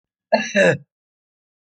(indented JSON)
{
  "cough_length": "1.8 s",
  "cough_amplitude": 25685,
  "cough_signal_mean_std_ratio": 0.35,
  "survey_phase": "alpha (2021-03-01 to 2021-08-12)",
  "age": "65+",
  "gender": "Male",
  "wearing_mask": "No",
  "symptom_none": true,
  "symptom_shortness_of_breath": true,
  "symptom_headache": true,
  "smoker_status": "Never smoked",
  "respiratory_condition_asthma": true,
  "respiratory_condition_other": false,
  "recruitment_source": "REACT",
  "submission_delay": "2 days",
  "covid_test_result": "Negative",
  "covid_test_method": "RT-qPCR"
}